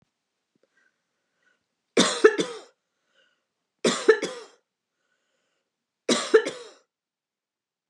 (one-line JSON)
{"three_cough_length": "7.9 s", "three_cough_amplitude": 28682, "three_cough_signal_mean_std_ratio": 0.26, "survey_phase": "beta (2021-08-13 to 2022-03-07)", "age": "45-64", "gender": "Female", "wearing_mask": "No", "symptom_none": true, "smoker_status": "Never smoked", "respiratory_condition_asthma": false, "respiratory_condition_other": false, "recruitment_source": "REACT", "submission_delay": "1 day", "covid_test_result": "Negative", "covid_test_method": "RT-qPCR", "influenza_a_test_result": "Negative", "influenza_b_test_result": "Negative"}